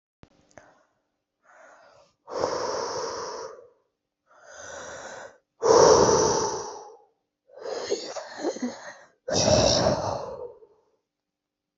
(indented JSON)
{
  "exhalation_length": "11.8 s",
  "exhalation_amplitude": 19268,
  "exhalation_signal_mean_std_ratio": 0.44,
  "survey_phase": "alpha (2021-03-01 to 2021-08-12)",
  "age": "18-44",
  "gender": "Female",
  "wearing_mask": "No",
  "symptom_cough_any": true,
  "symptom_new_continuous_cough": true,
  "symptom_abdominal_pain": true,
  "symptom_diarrhoea": true,
  "symptom_fever_high_temperature": true,
  "smoker_status": "Ex-smoker",
  "respiratory_condition_asthma": false,
  "respiratory_condition_other": false,
  "recruitment_source": "Test and Trace",
  "submission_delay": "1 day",
  "covid_test_result": "Positive",
  "covid_test_method": "RT-qPCR",
  "covid_ct_value": 17.6,
  "covid_ct_gene": "ORF1ab gene",
  "covid_ct_mean": 18.0,
  "covid_viral_load": "1200000 copies/ml",
  "covid_viral_load_category": "High viral load (>1M copies/ml)"
}